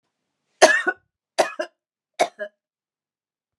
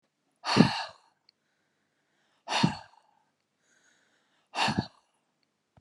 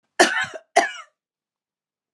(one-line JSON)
{"three_cough_length": "3.6 s", "three_cough_amplitude": 32476, "three_cough_signal_mean_std_ratio": 0.26, "exhalation_length": "5.8 s", "exhalation_amplitude": 21023, "exhalation_signal_mean_std_ratio": 0.27, "cough_length": "2.1 s", "cough_amplitude": 30184, "cough_signal_mean_std_ratio": 0.31, "survey_phase": "alpha (2021-03-01 to 2021-08-12)", "age": "65+", "gender": "Female", "wearing_mask": "No", "symptom_abdominal_pain": true, "smoker_status": "Ex-smoker", "respiratory_condition_asthma": false, "respiratory_condition_other": false, "recruitment_source": "REACT", "submission_delay": "2 days", "covid_test_result": "Negative", "covid_test_method": "RT-qPCR"}